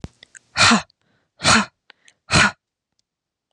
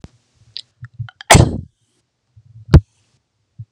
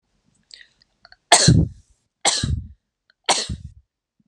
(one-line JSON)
{"exhalation_length": "3.5 s", "exhalation_amplitude": 30925, "exhalation_signal_mean_std_ratio": 0.35, "cough_length": "3.7 s", "cough_amplitude": 32768, "cough_signal_mean_std_ratio": 0.24, "three_cough_length": "4.3 s", "three_cough_amplitude": 32768, "three_cough_signal_mean_std_ratio": 0.34, "survey_phase": "beta (2021-08-13 to 2022-03-07)", "age": "18-44", "gender": "Female", "wearing_mask": "No", "symptom_other": true, "smoker_status": "Never smoked", "respiratory_condition_asthma": false, "respiratory_condition_other": false, "recruitment_source": "REACT", "submission_delay": "1 day", "covid_test_result": "Negative", "covid_test_method": "RT-qPCR", "influenza_a_test_result": "Negative", "influenza_b_test_result": "Negative"}